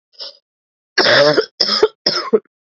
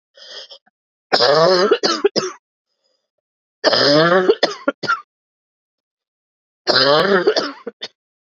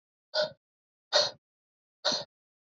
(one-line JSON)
{"cough_length": "2.6 s", "cough_amplitude": 32767, "cough_signal_mean_std_ratio": 0.5, "three_cough_length": "8.4 s", "three_cough_amplitude": 31072, "three_cough_signal_mean_std_ratio": 0.48, "exhalation_length": "2.6 s", "exhalation_amplitude": 11395, "exhalation_signal_mean_std_ratio": 0.33, "survey_phase": "beta (2021-08-13 to 2022-03-07)", "age": "45-64", "gender": "Female", "wearing_mask": "No", "symptom_cough_any": true, "symptom_runny_or_blocked_nose": true, "symptom_shortness_of_breath": true, "symptom_abdominal_pain": true, "symptom_fatigue": true, "symptom_fever_high_temperature": true, "symptom_change_to_sense_of_smell_or_taste": true, "symptom_other": true, "symptom_onset": "4 days", "smoker_status": "Never smoked", "respiratory_condition_asthma": true, "respiratory_condition_other": false, "recruitment_source": "Test and Trace", "submission_delay": "2 days", "covid_test_result": "Positive", "covid_test_method": "RT-qPCR", "covid_ct_value": 18.9, "covid_ct_gene": "ORF1ab gene", "covid_ct_mean": 20.8, "covid_viral_load": "160000 copies/ml", "covid_viral_load_category": "Low viral load (10K-1M copies/ml)"}